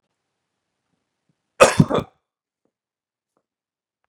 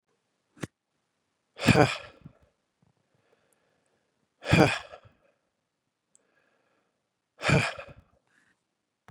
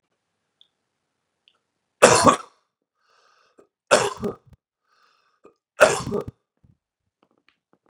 {"cough_length": "4.1 s", "cough_amplitude": 32768, "cough_signal_mean_std_ratio": 0.18, "exhalation_length": "9.1 s", "exhalation_amplitude": 19641, "exhalation_signal_mean_std_ratio": 0.22, "three_cough_length": "7.9 s", "three_cough_amplitude": 32768, "three_cough_signal_mean_std_ratio": 0.23, "survey_phase": "beta (2021-08-13 to 2022-03-07)", "age": "18-44", "gender": "Male", "wearing_mask": "No", "symptom_none": true, "smoker_status": "Never smoked", "respiratory_condition_asthma": false, "respiratory_condition_other": false, "recruitment_source": "REACT", "submission_delay": "2 days", "covid_test_result": "Negative", "covid_test_method": "RT-qPCR"}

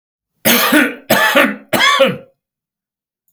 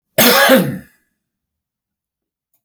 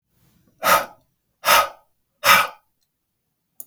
{"three_cough_length": "3.3 s", "three_cough_amplitude": 32768, "three_cough_signal_mean_std_ratio": 0.55, "cough_length": "2.6 s", "cough_amplitude": 32768, "cough_signal_mean_std_ratio": 0.38, "exhalation_length": "3.7 s", "exhalation_amplitude": 32768, "exhalation_signal_mean_std_ratio": 0.33, "survey_phase": "beta (2021-08-13 to 2022-03-07)", "age": "65+", "gender": "Male", "wearing_mask": "No", "symptom_cough_any": true, "smoker_status": "Ex-smoker", "respiratory_condition_asthma": false, "respiratory_condition_other": false, "recruitment_source": "REACT", "submission_delay": "0 days", "covid_test_result": "Negative", "covid_test_method": "RT-qPCR", "influenza_a_test_result": "Negative", "influenza_b_test_result": "Negative"}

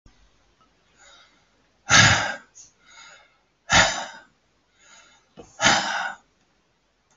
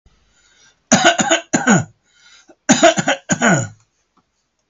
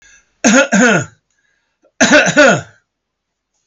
{"exhalation_length": "7.2 s", "exhalation_amplitude": 26689, "exhalation_signal_mean_std_ratio": 0.31, "cough_length": "4.7 s", "cough_amplitude": 32767, "cough_signal_mean_std_ratio": 0.44, "three_cough_length": "3.7 s", "three_cough_amplitude": 32768, "three_cough_signal_mean_std_ratio": 0.48, "survey_phase": "alpha (2021-03-01 to 2021-08-12)", "age": "65+", "gender": "Male", "wearing_mask": "No", "symptom_none": true, "smoker_status": "Never smoked", "respiratory_condition_asthma": false, "respiratory_condition_other": false, "recruitment_source": "REACT", "submission_delay": "2 days", "covid_test_result": "Negative", "covid_test_method": "RT-qPCR"}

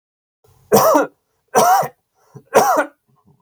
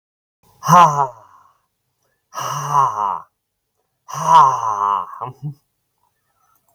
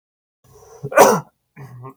{"three_cough_length": "3.4 s", "three_cough_amplitude": 32768, "three_cough_signal_mean_std_ratio": 0.46, "exhalation_length": "6.7 s", "exhalation_amplitude": 32768, "exhalation_signal_mean_std_ratio": 0.4, "cough_length": "2.0 s", "cough_amplitude": 32768, "cough_signal_mean_std_ratio": 0.31, "survey_phase": "beta (2021-08-13 to 2022-03-07)", "age": "18-44", "gender": "Male", "wearing_mask": "No", "symptom_none": true, "smoker_status": "Never smoked", "respiratory_condition_asthma": false, "respiratory_condition_other": false, "recruitment_source": "REACT", "submission_delay": "3 days", "covid_test_result": "Negative", "covid_test_method": "RT-qPCR"}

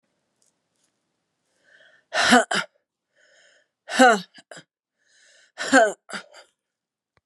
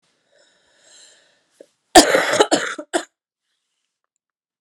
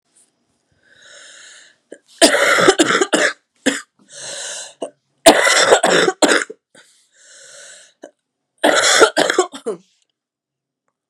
{"exhalation_length": "7.3 s", "exhalation_amplitude": 30001, "exhalation_signal_mean_std_ratio": 0.27, "cough_length": "4.6 s", "cough_amplitude": 32768, "cough_signal_mean_std_ratio": 0.27, "three_cough_length": "11.1 s", "three_cough_amplitude": 32768, "three_cough_signal_mean_std_ratio": 0.42, "survey_phase": "beta (2021-08-13 to 2022-03-07)", "age": "45-64", "gender": "Female", "wearing_mask": "No", "symptom_cough_any": true, "symptom_new_continuous_cough": true, "symptom_runny_or_blocked_nose": true, "symptom_diarrhoea": true, "symptom_fatigue": true, "symptom_headache": true, "symptom_onset": "3 days", "smoker_status": "Never smoked", "respiratory_condition_asthma": false, "respiratory_condition_other": false, "recruitment_source": "Test and Trace", "submission_delay": "1 day", "covid_test_result": "Positive", "covid_test_method": "ePCR"}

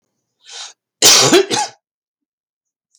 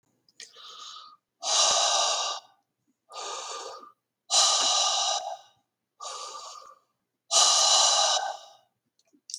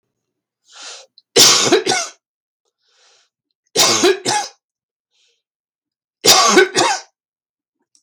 {"cough_length": "3.0 s", "cough_amplitude": 32768, "cough_signal_mean_std_ratio": 0.37, "exhalation_length": "9.4 s", "exhalation_amplitude": 13834, "exhalation_signal_mean_std_ratio": 0.53, "three_cough_length": "8.0 s", "three_cough_amplitude": 32768, "three_cough_signal_mean_std_ratio": 0.4, "survey_phase": "beta (2021-08-13 to 2022-03-07)", "age": "65+", "gender": "Male", "wearing_mask": "No", "symptom_cough_any": true, "smoker_status": "Never smoked", "respiratory_condition_asthma": false, "respiratory_condition_other": false, "recruitment_source": "REACT", "submission_delay": "2 days", "covid_test_result": "Negative", "covid_test_method": "RT-qPCR", "influenza_a_test_result": "Unknown/Void", "influenza_b_test_result": "Unknown/Void"}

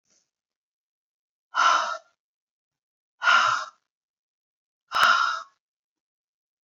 {"exhalation_length": "6.7 s", "exhalation_amplitude": 18770, "exhalation_signal_mean_std_ratio": 0.35, "survey_phase": "beta (2021-08-13 to 2022-03-07)", "age": "45-64", "gender": "Female", "wearing_mask": "No", "symptom_cough_any": true, "symptom_runny_or_blocked_nose": true, "symptom_shortness_of_breath": true, "symptom_sore_throat": true, "smoker_status": "Never smoked", "respiratory_condition_asthma": true, "respiratory_condition_other": false, "recruitment_source": "Test and Trace", "submission_delay": "1 day", "covid_test_result": "Positive", "covid_test_method": "RT-qPCR", "covid_ct_value": 27.3, "covid_ct_gene": "ORF1ab gene"}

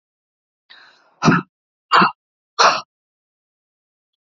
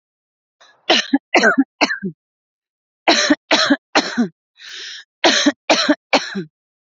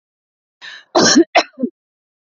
{"exhalation_length": "4.3 s", "exhalation_amplitude": 30609, "exhalation_signal_mean_std_ratio": 0.29, "three_cough_length": "6.9 s", "three_cough_amplitude": 29752, "three_cough_signal_mean_std_ratio": 0.45, "cough_length": "2.4 s", "cough_amplitude": 31394, "cough_signal_mean_std_ratio": 0.35, "survey_phase": "beta (2021-08-13 to 2022-03-07)", "age": "18-44", "gender": "Female", "wearing_mask": "No", "symptom_none": true, "smoker_status": "Current smoker (e-cigarettes or vapes only)", "respiratory_condition_asthma": false, "respiratory_condition_other": false, "recruitment_source": "REACT", "submission_delay": "19 days", "covid_test_result": "Negative", "covid_test_method": "RT-qPCR"}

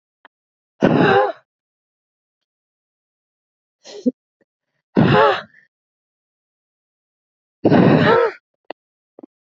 {"exhalation_length": "9.6 s", "exhalation_amplitude": 30632, "exhalation_signal_mean_std_ratio": 0.34, "survey_phase": "beta (2021-08-13 to 2022-03-07)", "age": "18-44", "gender": "Female", "wearing_mask": "No", "symptom_runny_or_blocked_nose": true, "symptom_shortness_of_breath": true, "symptom_sore_throat": true, "symptom_fatigue": true, "symptom_headache": true, "symptom_onset": "6 days", "smoker_status": "Never smoked", "respiratory_condition_asthma": false, "respiratory_condition_other": false, "recruitment_source": "Test and Trace", "submission_delay": "2 days", "covid_test_result": "Positive", "covid_test_method": "RT-qPCR", "covid_ct_value": 15.8, "covid_ct_gene": "ORF1ab gene"}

